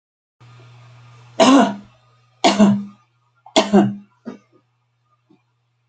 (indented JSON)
{
  "three_cough_length": "5.9 s",
  "three_cough_amplitude": 29579,
  "three_cough_signal_mean_std_ratio": 0.35,
  "survey_phase": "beta (2021-08-13 to 2022-03-07)",
  "age": "65+",
  "gender": "Female",
  "wearing_mask": "No",
  "symptom_none": true,
  "smoker_status": "Never smoked",
  "respiratory_condition_asthma": false,
  "respiratory_condition_other": false,
  "recruitment_source": "REACT",
  "submission_delay": "2 days",
  "covid_test_result": "Negative",
  "covid_test_method": "RT-qPCR"
}